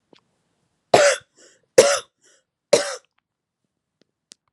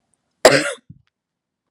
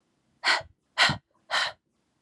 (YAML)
three_cough_length: 4.5 s
three_cough_amplitude: 32768
three_cough_signal_mean_std_ratio: 0.26
cough_length: 1.7 s
cough_amplitude: 32768
cough_signal_mean_std_ratio: 0.26
exhalation_length: 2.2 s
exhalation_amplitude: 14804
exhalation_signal_mean_std_ratio: 0.39
survey_phase: beta (2021-08-13 to 2022-03-07)
age: 18-44
gender: Female
wearing_mask: 'No'
symptom_none: true
smoker_status: Never smoked
respiratory_condition_asthma: false
respiratory_condition_other: false
recruitment_source: REACT
submission_delay: 1 day
covid_test_result: Negative
covid_test_method: RT-qPCR
influenza_a_test_result: Negative
influenza_b_test_result: Negative